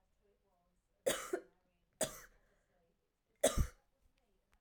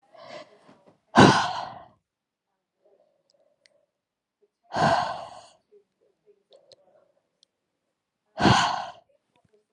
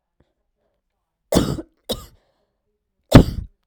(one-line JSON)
{"three_cough_length": "4.6 s", "three_cough_amplitude": 5282, "three_cough_signal_mean_std_ratio": 0.26, "exhalation_length": "9.7 s", "exhalation_amplitude": 28567, "exhalation_signal_mean_std_ratio": 0.27, "cough_length": "3.7 s", "cough_amplitude": 32768, "cough_signal_mean_std_ratio": 0.22, "survey_phase": "alpha (2021-03-01 to 2021-08-12)", "age": "18-44", "gender": "Female", "wearing_mask": "No", "symptom_cough_any": true, "symptom_fatigue": true, "symptom_change_to_sense_of_smell_or_taste": true, "symptom_loss_of_taste": true, "smoker_status": "Never smoked", "respiratory_condition_asthma": false, "respiratory_condition_other": false, "recruitment_source": "Test and Trace", "submission_delay": "2 days", "covid_test_result": "Positive", "covid_test_method": "RT-qPCR", "covid_ct_value": 22.1, "covid_ct_gene": "ORF1ab gene"}